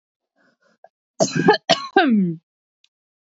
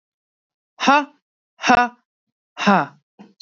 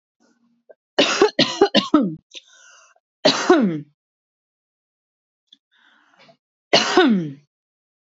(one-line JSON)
{"cough_length": "3.2 s", "cough_amplitude": 26763, "cough_signal_mean_std_ratio": 0.4, "exhalation_length": "3.4 s", "exhalation_amplitude": 27230, "exhalation_signal_mean_std_ratio": 0.34, "three_cough_length": "8.0 s", "three_cough_amplitude": 32767, "three_cough_signal_mean_std_ratio": 0.37, "survey_phase": "beta (2021-08-13 to 2022-03-07)", "age": "45-64", "gender": "Male", "wearing_mask": "No", "symptom_cough_any": true, "symptom_runny_or_blocked_nose": true, "symptom_sore_throat": true, "symptom_fatigue": true, "symptom_headache": true, "smoker_status": "Ex-smoker", "respiratory_condition_asthma": false, "respiratory_condition_other": false, "recruitment_source": "Test and Trace", "submission_delay": "1 day", "covid_test_result": "Negative", "covid_test_method": "RT-qPCR"}